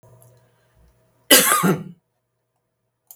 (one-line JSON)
{"three_cough_length": "3.2 s", "three_cough_amplitude": 32768, "three_cough_signal_mean_std_ratio": 0.3, "survey_phase": "beta (2021-08-13 to 2022-03-07)", "age": "65+", "gender": "Female", "wearing_mask": "No", "symptom_none": true, "smoker_status": "Ex-smoker", "respiratory_condition_asthma": false, "respiratory_condition_other": false, "recruitment_source": "REACT", "submission_delay": "2 days", "covid_test_result": "Negative", "covid_test_method": "RT-qPCR", "influenza_a_test_result": "Negative", "influenza_b_test_result": "Negative"}